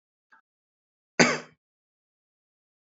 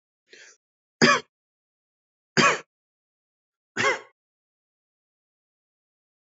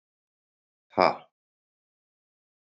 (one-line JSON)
{"cough_length": "2.8 s", "cough_amplitude": 31173, "cough_signal_mean_std_ratio": 0.18, "three_cough_length": "6.2 s", "three_cough_amplitude": 21962, "three_cough_signal_mean_std_ratio": 0.23, "exhalation_length": "2.6 s", "exhalation_amplitude": 20161, "exhalation_signal_mean_std_ratio": 0.15, "survey_phase": "beta (2021-08-13 to 2022-03-07)", "age": "45-64", "gender": "Male", "wearing_mask": "No", "symptom_cough_any": true, "symptom_runny_or_blocked_nose": true, "smoker_status": "Never smoked", "respiratory_condition_asthma": false, "respiratory_condition_other": false, "recruitment_source": "Test and Trace", "submission_delay": "0 days", "covid_test_result": "Positive", "covid_test_method": "LFT"}